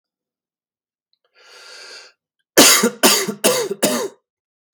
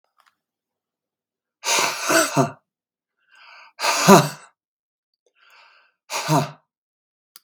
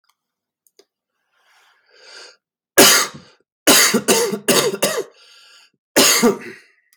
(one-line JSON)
{"three_cough_length": "4.7 s", "three_cough_amplitude": 32768, "three_cough_signal_mean_std_ratio": 0.38, "exhalation_length": "7.4 s", "exhalation_amplitude": 32767, "exhalation_signal_mean_std_ratio": 0.32, "cough_length": "7.0 s", "cough_amplitude": 32768, "cough_signal_mean_std_ratio": 0.42, "survey_phase": "beta (2021-08-13 to 2022-03-07)", "age": "18-44", "gender": "Male", "wearing_mask": "No", "symptom_cough_any": true, "symptom_runny_or_blocked_nose": true, "symptom_onset": "12 days", "smoker_status": "Never smoked", "respiratory_condition_asthma": false, "respiratory_condition_other": false, "recruitment_source": "REACT", "submission_delay": "1 day", "covid_test_result": "Negative", "covid_test_method": "RT-qPCR", "influenza_a_test_result": "Negative", "influenza_b_test_result": "Negative"}